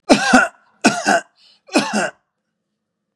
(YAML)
three_cough_length: 3.2 s
three_cough_amplitude: 32767
three_cough_signal_mean_std_ratio: 0.43
survey_phase: beta (2021-08-13 to 2022-03-07)
age: 45-64
gender: Male
wearing_mask: 'No'
symptom_none: true
smoker_status: Never smoked
respiratory_condition_asthma: false
respiratory_condition_other: false
recruitment_source: Test and Trace
submission_delay: 1 day
covid_test_result: Negative
covid_test_method: RT-qPCR